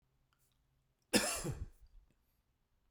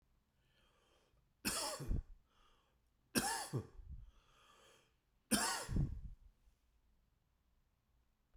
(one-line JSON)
{"cough_length": "2.9 s", "cough_amplitude": 5629, "cough_signal_mean_std_ratio": 0.3, "three_cough_length": "8.4 s", "three_cough_amplitude": 3448, "three_cough_signal_mean_std_ratio": 0.38, "survey_phase": "beta (2021-08-13 to 2022-03-07)", "age": "65+", "gender": "Male", "wearing_mask": "No", "symptom_none": true, "smoker_status": "Ex-smoker", "respiratory_condition_asthma": false, "respiratory_condition_other": false, "recruitment_source": "REACT", "submission_delay": "1 day", "covid_test_result": "Negative", "covid_test_method": "RT-qPCR"}